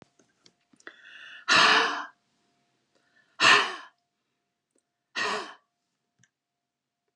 {"exhalation_length": "7.2 s", "exhalation_amplitude": 18204, "exhalation_signal_mean_std_ratio": 0.3, "survey_phase": "alpha (2021-03-01 to 2021-08-12)", "age": "45-64", "gender": "Female", "wearing_mask": "No", "symptom_none": true, "smoker_status": "Never smoked", "respiratory_condition_asthma": false, "respiratory_condition_other": false, "recruitment_source": "REACT", "submission_delay": "1 day", "covid_test_result": "Negative", "covid_test_method": "RT-qPCR"}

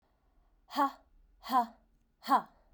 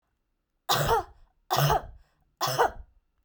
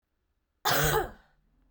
{"exhalation_length": "2.7 s", "exhalation_amplitude": 5845, "exhalation_signal_mean_std_ratio": 0.33, "three_cough_length": "3.2 s", "three_cough_amplitude": 11839, "three_cough_signal_mean_std_ratio": 0.46, "cough_length": "1.7 s", "cough_amplitude": 8465, "cough_signal_mean_std_ratio": 0.43, "survey_phase": "beta (2021-08-13 to 2022-03-07)", "age": "18-44", "gender": "Female", "wearing_mask": "No", "symptom_runny_or_blocked_nose": true, "symptom_sore_throat": true, "symptom_change_to_sense_of_smell_or_taste": true, "symptom_onset": "4 days", "smoker_status": "Never smoked", "respiratory_condition_asthma": false, "respiratory_condition_other": false, "recruitment_source": "Test and Trace", "submission_delay": "2 days", "covid_test_method": "PCR", "covid_ct_value": 32.9, "covid_ct_gene": "ORF1ab gene"}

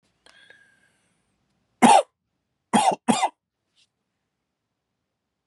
{"three_cough_length": "5.5 s", "three_cough_amplitude": 29013, "three_cough_signal_mean_std_ratio": 0.25, "survey_phase": "beta (2021-08-13 to 2022-03-07)", "age": "18-44", "gender": "Male", "wearing_mask": "No", "symptom_cough_any": true, "symptom_runny_or_blocked_nose": true, "symptom_sore_throat": true, "symptom_fever_high_temperature": true, "symptom_onset": "4 days", "smoker_status": "Current smoker (1 to 10 cigarettes per day)", "respiratory_condition_asthma": false, "respiratory_condition_other": false, "recruitment_source": "Test and Trace", "submission_delay": "2 days", "covid_test_result": "Positive", "covid_test_method": "RT-qPCR", "covid_ct_value": 23.4, "covid_ct_gene": "ORF1ab gene", "covid_ct_mean": 24.1, "covid_viral_load": "12000 copies/ml", "covid_viral_load_category": "Low viral load (10K-1M copies/ml)"}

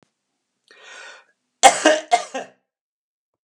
{"three_cough_length": "3.4 s", "three_cough_amplitude": 32768, "three_cough_signal_mean_std_ratio": 0.27, "survey_phase": "beta (2021-08-13 to 2022-03-07)", "age": "65+", "gender": "Male", "wearing_mask": "No", "symptom_none": true, "smoker_status": "Never smoked", "respiratory_condition_asthma": false, "respiratory_condition_other": false, "recruitment_source": "REACT", "submission_delay": "0 days", "covid_test_result": "Negative", "covid_test_method": "RT-qPCR"}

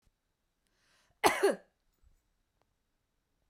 {"cough_length": "3.5 s", "cough_amplitude": 11730, "cough_signal_mean_std_ratio": 0.21, "survey_phase": "beta (2021-08-13 to 2022-03-07)", "age": "45-64", "gender": "Female", "wearing_mask": "No", "symptom_fatigue": true, "symptom_onset": "2 days", "smoker_status": "Never smoked", "respiratory_condition_asthma": false, "respiratory_condition_other": false, "recruitment_source": "Test and Trace", "submission_delay": "2 days", "covid_test_result": "Negative", "covid_test_method": "RT-qPCR"}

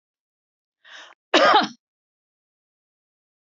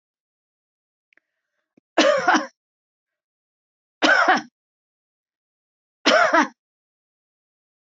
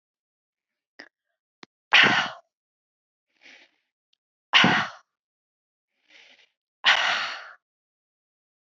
{"cough_length": "3.6 s", "cough_amplitude": 24879, "cough_signal_mean_std_ratio": 0.25, "three_cough_length": "7.9 s", "three_cough_amplitude": 22425, "three_cough_signal_mean_std_ratio": 0.31, "exhalation_length": "8.7 s", "exhalation_amplitude": 22569, "exhalation_signal_mean_std_ratio": 0.27, "survey_phase": "beta (2021-08-13 to 2022-03-07)", "age": "65+", "gender": "Female", "wearing_mask": "No", "symptom_none": true, "smoker_status": "Ex-smoker", "respiratory_condition_asthma": false, "respiratory_condition_other": false, "recruitment_source": "REACT", "submission_delay": "2 days", "covid_test_result": "Negative", "covid_test_method": "RT-qPCR", "influenza_a_test_result": "Negative", "influenza_b_test_result": "Negative"}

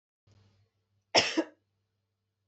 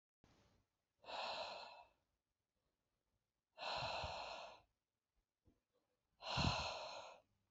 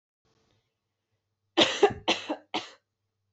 {"cough_length": "2.5 s", "cough_amplitude": 14714, "cough_signal_mean_std_ratio": 0.23, "exhalation_length": "7.5 s", "exhalation_amplitude": 1511, "exhalation_signal_mean_std_ratio": 0.44, "three_cough_length": "3.3 s", "three_cough_amplitude": 16977, "three_cough_signal_mean_std_ratio": 0.29, "survey_phase": "beta (2021-08-13 to 2022-03-07)", "age": "18-44", "gender": "Female", "wearing_mask": "No", "symptom_none": true, "smoker_status": "Never smoked", "respiratory_condition_asthma": false, "respiratory_condition_other": false, "recruitment_source": "REACT", "submission_delay": "2 days", "covid_test_result": "Negative", "covid_test_method": "RT-qPCR", "influenza_a_test_result": "Unknown/Void", "influenza_b_test_result": "Unknown/Void"}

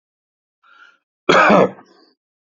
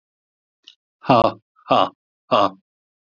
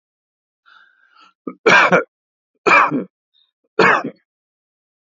{"cough_length": "2.5 s", "cough_amplitude": 28224, "cough_signal_mean_std_ratio": 0.34, "exhalation_length": "3.2 s", "exhalation_amplitude": 27789, "exhalation_signal_mean_std_ratio": 0.31, "three_cough_length": "5.1 s", "three_cough_amplitude": 31050, "three_cough_signal_mean_std_ratio": 0.34, "survey_phase": "alpha (2021-03-01 to 2021-08-12)", "age": "65+", "gender": "Male", "wearing_mask": "No", "symptom_none": true, "smoker_status": "Ex-smoker", "respiratory_condition_asthma": false, "respiratory_condition_other": false, "recruitment_source": "REACT", "submission_delay": "1 day", "covid_test_result": "Negative", "covid_test_method": "RT-qPCR"}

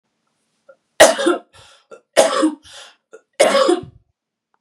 {"three_cough_length": "4.6 s", "three_cough_amplitude": 32768, "three_cough_signal_mean_std_ratio": 0.38, "survey_phase": "beta (2021-08-13 to 2022-03-07)", "age": "18-44", "gender": "Female", "wearing_mask": "No", "symptom_none": true, "smoker_status": "Never smoked", "respiratory_condition_asthma": true, "respiratory_condition_other": false, "recruitment_source": "Test and Trace", "submission_delay": "3 days", "covid_test_result": "Negative", "covid_test_method": "RT-qPCR"}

